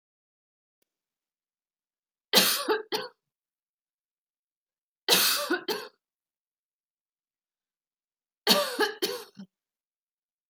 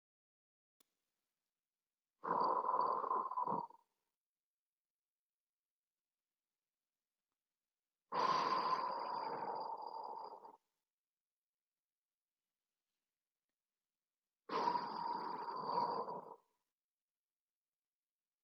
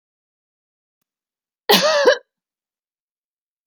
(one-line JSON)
{"three_cough_length": "10.5 s", "three_cough_amplitude": 19627, "three_cough_signal_mean_std_ratio": 0.3, "exhalation_length": "18.4 s", "exhalation_amplitude": 2399, "exhalation_signal_mean_std_ratio": 0.42, "cough_length": "3.7 s", "cough_amplitude": 32768, "cough_signal_mean_std_ratio": 0.28, "survey_phase": "beta (2021-08-13 to 2022-03-07)", "age": "18-44", "gender": "Female", "wearing_mask": "No", "symptom_none": true, "smoker_status": "Current smoker (1 to 10 cigarettes per day)", "respiratory_condition_asthma": false, "respiratory_condition_other": false, "recruitment_source": "REACT", "submission_delay": "1 day", "covid_test_result": "Negative", "covid_test_method": "RT-qPCR", "influenza_a_test_result": "Negative", "influenza_b_test_result": "Negative"}